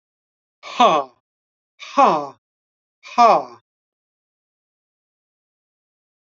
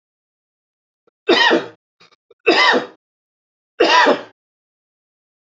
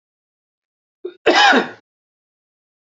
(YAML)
exhalation_length: 6.2 s
exhalation_amplitude: 28899
exhalation_signal_mean_std_ratio: 0.27
three_cough_length: 5.5 s
three_cough_amplitude: 29745
three_cough_signal_mean_std_ratio: 0.37
cough_length: 3.0 s
cough_amplitude: 29563
cough_signal_mean_std_ratio: 0.3
survey_phase: beta (2021-08-13 to 2022-03-07)
age: 45-64
gender: Male
wearing_mask: 'No'
symptom_runny_or_blocked_nose: true
smoker_status: Never smoked
respiratory_condition_asthma: true
respiratory_condition_other: false
recruitment_source: REACT
submission_delay: 1 day
covid_test_result: Negative
covid_test_method: RT-qPCR